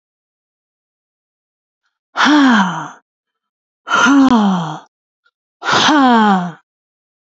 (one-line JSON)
{"exhalation_length": "7.3 s", "exhalation_amplitude": 29261, "exhalation_signal_mean_std_ratio": 0.49, "survey_phase": "alpha (2021-03-01 to 2021-08-12)", "age": "65+", "gender": "Female", "wearing_mask": "No", "symptom_cough_any": true, "symptom_headache": true, "symptom_onset": "12 days", "smoker_status": "Never smoked", "respiratory_condition_asthma": false, "respiratory_condition_other": false, "recruitment_source": "REACT", "submission_delay": "2 days", "covid_test_result": "Negative", "covid_test_method": "RT-qPCR"}